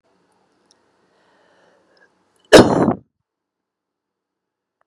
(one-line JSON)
{"cough_length": "4.9 s", "cough_amplitude": 32768, "cough_signal_mean_std_ratio": 0.2, "survey_phase": "beta (2021-08-13 to 2022-03-07)", "age": "45-64", "gender": "Female", "wearing_mask": "No", "symptom_none": true, "symptom_onset": "11 days", "smoker_status": "Current smoker (1 to 10 cigarettes per day)", "respiratory_condition_asthma": false, "respiratory_condition_other": false, "recruitment_source": "REACT", "submission_delay": "1 day", "covid_test_result": "Negative", "covid_test_method": "RT-qPCR", "influenza_a_test_result": "Negative", "influenza_b_test_result": "Negative"}